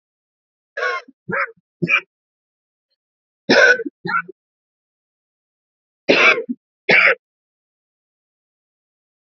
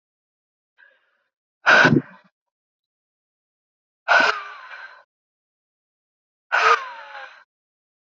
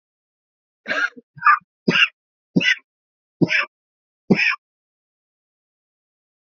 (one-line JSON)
{"three_cough_length": "9.3 s", "three_cough_amplitude": 32334, "three_cough_signal_mean_std_ratio": 0.32, "exhalation_length": "8.1 s", "exhalation_amplitude": 26311, "exhalation_signal_mean_std_ratio": 0.28, "cough_length": "6.5 s", "cough_amplitude": 26441, "cough_signal_mean_std_ratio": 0.32, "survey_phase": "alpha (2021-03-01 to 2021-08-12)", "age": "45-64", "gender": "Female", "wearing_mask": "No", "symptom_cough_any": true, "symptom_fatigue": true, "symptom_fever_high_temperature": true, "symptom_headache": true, "symptom_change_to_sense_of_smell_or_taste": true, "symptom_loss_of_taste": true, "symptom_onset": "2 days", "smoker_status": "Current smoker (11 or more cigarettes per day)", "respiratory_condition_asthma": false, "respiratory_condition_other": false, "recruitment_source": "Test and Trace", "submission_delay": "1 day", "covid_test_result": "Positive", "covid_test_method": "RT-qPCR", "covid_ct_value": 14.6, "covid_ct_gene": "ORF1ab gene", "covid_ct_mean": 14.9, "covid_viral_load": "13000000 copies/ml", "covid_viral_load_category": "High viral load (>1M copies/ml)"}